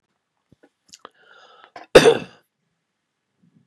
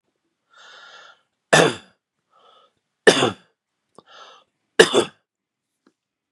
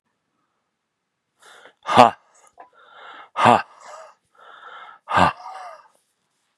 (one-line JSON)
{"cough_length": "3.7 s", "cough_amplitude": 32768, "cough_signal_mean_std_ratio": 0.18, "three_cough_length": "6.3 s", "three_cough_amplitude": 32768, "three_cough_signal_mean_std_ratio": 0.24, "exhalation_length": "6.6 s", "exhalation_amplitude": 32768, "exhalation_signal_mean_std_ratio": 0.25, "survey_phase": "beta (2021-08-13 to 2022-03-07)", "age": "45-64", "gender": "Male", "wearing_mask": "No", "symptom_none": true, "smoker_status": "Ex-smoker", "respiratory_condition_asthma": false, "respiratory_condition_other": false, "recruitment_source": "REACT", "submission_delay": "2 days", "covid_test_result": "Negative", "covid_test_method": "RT-qPCR", "influenza_a_test_result": "Negative", "influenza_b_test_result": "Negative"}